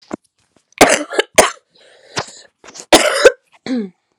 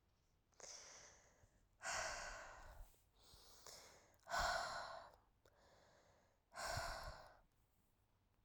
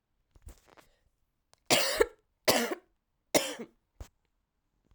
{"cough_length": "4.2 s", "cough_amplitude": 32768, "cough_signal_mean_std_ratio": 0.36, "exhalation_length": "8.4 s", "exhalation_amplitude": 1074, "exhalation_signal_mean_std_ratio": 0.48, "three_cough_length": "4.9 s", "three_cough_amplitude": 12535, "three_cough_signal_mean_std_ratio": 0.3, "survey_phase": "alpha (2021-03-01 to 2021-08-12)", "age": "18-44", "gender": "Female", "wearing_mask": "No", "symptom_cough_any": true, "symptom_new_continuous_cough": true, "symptom_fatigue": true, "symptom_headache": true, "symptom_change_to_sense_of_smell_or_taste": true, "symptom_loss_of_taste": true, "symptom_onset": "4 days", "smoker_status": "Never smoked", "respiratory_condition_asthma": false, "respiratory_condition_other": false, "recruitment_source": "Test and Trace", "submission_delay": "2 days", "covid_test_result": "Positive", "covid_test_method": "RT-qPCR", "covid_ct_value": 16.2, "covid_ct_gene": "ORF1ab gene", "covid_ct_mean": 16.6, "covid_viral_load": "3600000 copies/ml", "covid_viral_load_category": "High viral load (>1M copies/ml)"}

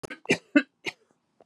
{"cough_length": "1.5 s", "cough_amplitude": 15816, "cough_signal_mean_std_ratio": 0.26, "survey_phase": "beta (2021-08-13 to 2022-03-07)", "age": "45-64", "gender": "Female", "wearing_mask": "No", "symptom_cough_any": true, "symptom_runny_or_blocked_nose": true, "symptom_fatigue": true, "symptom_headache": true, "smoker_status": "Never smoked", "respiratory_condition_asthma": false, "respiratory_condition_other": false, "recruitment_source": "Test and Trace", "submission_delay": "2 days", "covid_test_result": "Positive", "covid_test_method": "RT-qPCR", "covid_ct_value": 30.1, "covid_ct_gene": "ORF1ab gene", "covid_ct_mean": 30.5, "covid_viral_load": "98 copies/ml", "covid_viral_load_category": "Minimal viral load (< 10K copies/ml)"}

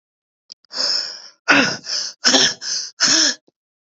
{"exhalation_length": "3.9 s", "exhalation_amplitude": 30340, "exhalation_signal_mean_std_ratio": 0.52, "survey_phase": "beta (2021-08-13 to 2022-03-07)", "age": "18-44", "gender": "Female", "wearing_mask": "No", "symptom_none": true, "smoker_status": "Ex-smoker", "respiratory_condition_asthma": false, "respiratory_condition_other": false, "recruitment_source": "REACT", "submission_delay": "3 days", "covid_test_result": "Negative", "covid_test_method": "RT-qPCR", "influenza_a_test_result": "Negative", "influenza_b_test_result": "Negative"}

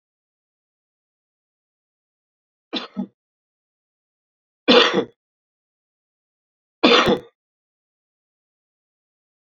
{"three_cough_length": "9.5 s", "three_cough_amplitude": 32634, "three_cough_signal_mean_std_ratio": 0.22, "survey_phase": "beta (2021-08-13 to 2022-03-07)", "age": "45-64", "gender": "Male", "wearing_mask": "No", "symptom_cough_any": true, "symptom_fatigue": true, "symptom_change_to_sense_of_smell_or_taste": true, "symptom_onset": "7 days", "smoker_status": "Ex-smoker", "respiratory_condition_asthma": false, "respiratory_condition_other": false, "recruitment_source": "Test and Trace", "submission_delay": "3 days", "covid_test_result": "Positive", "covid_test_method": "RT-qPCR", "covid_ct_value": 33.5, "covid_ct_gene": "N gene"}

